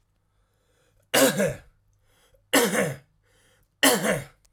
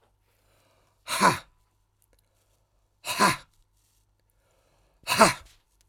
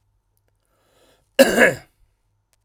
{"three_cough_length": "4.5 s", "three_cough_amplitude": 22900, "three_cough_signal_mean_std_ratio": 0.4, "exhalation_length": "5.9 s", "exhalation_amplitude": 23015, "exhalation_signal_mean_std_ratio": 0.26, "cough_length": "2.6 s", "cough_amplitude": 32768, "cough_signal_mean_std_ratio": 0.26, "survey_phase": "beta (2021-08-13 to 2022-03-07)", "age": "18-44", "gender": "Male", "wearing_mask": "No", "symptom_runny_or_blocked_nose": true, "smoker_status": "Never smoked", "respiratory_condition_asthma": true, "respiratory_condition_other": false, "recruitment_source": "REACT", "submission_delay": "1 day", "covid_test_result": "Negative", "covid_test_method": "RT-qPCR"}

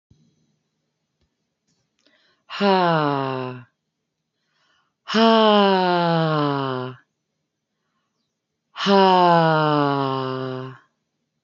{"exhalation_length": "11.4 s", "exhalation_amplitude": 24247, "exhalation_signal_mean_std_ratio": 0.48, "survey_phase": "beta (2021-08-13 to 2022-03-07)", "age": "45-64", "gender": "Female", "wearing_mask": "No", "symptom_none": true, "smoker_status": "Never smoked", "respiratory_condition_asthma": false, "respiratory_condition_other": false, "recruitment_source": "REACT", "submission_delay": "3 days", "covid_test_result": "Negative", "covid_test_method": "RT-qPCR", "influenza_a_test_result": "Negative", "influenza_b_test_result": "Negative"}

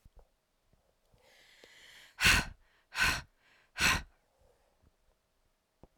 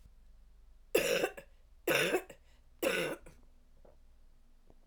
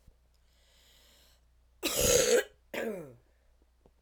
{"exhalation_length": "6.0 s", "exhalation_amplitude": 7312, "exhalation_signal_mean_std_ratio": 0.28, "three_cough_length": "4.9 s", "three_cough_amplitude": 6944, "three_cough_signal_mean_std_ratio": 0.44, "cough_length": "4.0 s", "cough_amplitude": 9907, "cough_signal_mean_std_ratio": 0.37, "survey_phase": "alpha (2021-03-01 to 2021-08-12)", "age": "45-64", "gender": "Female", "wearing_mask": "No", "symptom_none": true, "symptom_onset": "4 days", "smoker_status": "Never smoked", "respiratory_condition_asthma": false, "respiratory_condition_other": false, "recruitment_source": "REACT", "submission_delay": "2 days", "covid_test_result": "Negative", "covid_test_method": "RT-qPCR"}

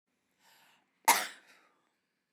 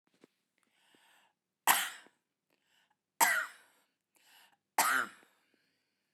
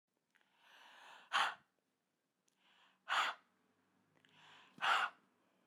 {"cough_length": "2.3 s", "cough_amplitude": 9593, "cough_signal_mean_std_ratio": 0.2, "three_cough_length": "6.1 s", "three_cough_amplitude": 10080, "three_cough_signal_mean_std_ratio": 0.27, "exhalation_length": "5.7 s", "exhalation_amplitude": 2599, "exhalation_signal_mean_std_ratio": 0.31, "survey_phase": "beta (2021-08-13 to 2022-03-07)", "age": "45-64", "gender": "Female", "wearing_mask": "No", "symptom_none": true, "smoker_status": "Never smoked", "respiratory_condition_asthma": false, "respiratory_condition_other": false, "recruitment_source": "REACT", "submission_delay": "3 days", "covid_test_result": "Negative", "covid_test_method": "RT-qPCR"}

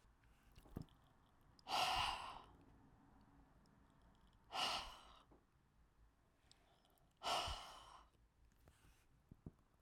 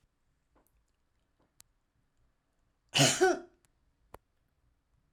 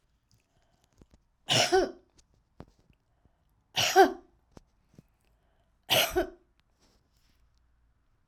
{"exhalation_length": "9.8 s", "exhalation_amplitude": 1226, "exhalation_signal_mean_std_ratio": 0.38, "cough_length": "5.1 s", "cough_amplitude": 8980, "cough_signal_mean_std_ratio": 0.22, "three_cough_length": "8.3 s", "three_cough_amplitude": 16135, "three_cough_signal_mean_std_ratio": 0.26, "survey_phase": "alpha (2021-03-01 to 2021-08-12)", "age": "65+", "gender": "Female", "wearing_mask": "No", "symptom_none": true, "symptom_onset": "2 days", "smoker_status": "Never smoked", "respiratory_condition_asthma": false, "respiratory_condition_other": false, "recruitment_source": "REACT", "submission_delay": "3 days", "covid_test_result": "Negative", "covid_test_method": "RT-qPCR"}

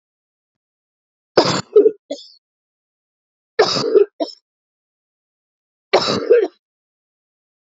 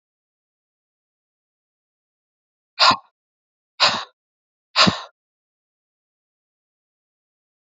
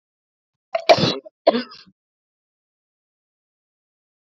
{"three_cough_length": "7.8 s", "three_cough_amplitude": 32356, "three_cough_signal_mean_std_ratio": 0.31, "exhalation_length": "7.8 s", "exhalation_amplitude": 28068, "exhalation_signal_mean_std_ratio": 0.2, "cough_length": "4.3 s", "cough_amplitude": 32767, "cough_signal_mean_std_ratio": 0.23, "survey_phase": "beta (2021-08-13 to 2022-03-07)", "age": "45-64", "gender": "Female", "wearing_mask": "No", "symptom_cough_any": true, "symptom_runny_or_blocked_nose": true, "symptom_shortness_of_breath": true, "symptom_fatigue": true, "symptom_headache": true, "symptom_other": true, "smoker_status": "Never smoked", "respiratory_condition_asthma": false, "respiratory_condition_other": false, "recruitment_source": "Test and Trace", "submission_delay": "0 days", "covid_test_result": "Positive", "covid_test_method": "LFT"}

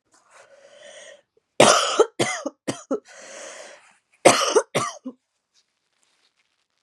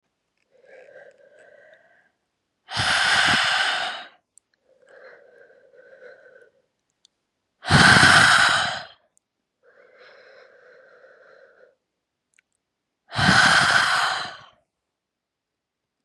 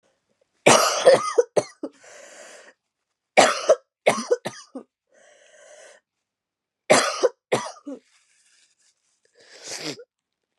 {"cough_length": "6.8 s", "cough_amplitude": 32686, "cough_signal_mean_std_ratio": 0.32, "exhalation_length": "16.0 s", "exhalation_amplitude": 29477, "exhalation_signal_mean_std_ratio": 0.37, "three_cough_length": "10.6 s", "three_cough_amplitude": 29706, "three_cough_signal_mean_std_ratio": 0.31, "survey_phase": "beta (2021-08-13 to 2022-03-07)", "age": "18-44", "gender": "Female", "wearing_mask": "No", "symptom_cough_any": true, "symptom_new_continuous_cough": true, "symptom_runny_or_blocked_nose": true, "symptom_shortness_of_breath": true, "symptom_sore_throat": true, "symptom_fatigue": true, "symptom_headache": true, "symptom_onset": "4 days", "smoker_status": "Prefer not to say", "respiratory_condition_asthma": true, "respiratory_condition_other": false, "recruitment_source": "Test and Trace", "submission_delay": "2 days", "covid_test_result": "Positive", "covid_test_method": "RT-qPCR", "covid_ct_value": 20.0, "covid_ct_gene": "ORF1ab gene", "covid_ct_mean": 20.2, "covid_viral_load": "230000 copies/ml", "covid_viral_load_category": "Low viral load (10K-1M copies/ml)"}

